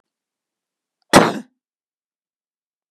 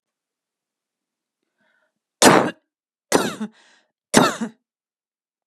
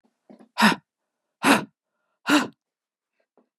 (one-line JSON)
{"cough_length": "2.9 s", "cough_amplitude": 32768, "cough_signal_mean_std_ratio": 0.19, "three_cough_length": "5.5 s", "three_cough_amplitude": 32768, "three_cough_signal_mean_std_ratio": 0.27, "exhalation_length": "3.6 s", "exhalation_amplitude": 21605, "exhalation_signal_mean_std_ratio": 0.3, "survey_phase": "beta (2021-08-13 to 2022-03-07)", "age": "45-64", "gender": "Female", "wearing_mask": "No", "symptom_none": true, "smoker_status": "Never smoked", "respiratory_condition_asthma": false, "respiratory_condition_other": false, "recruitment_source": "REACT", "submission_delay": "3 days", "covid_test_result": "Negative", "covid_test_method": "RT-qPCR", "influenza_a_test_result": "Negative", "influenza_b_test_result": "Negative"}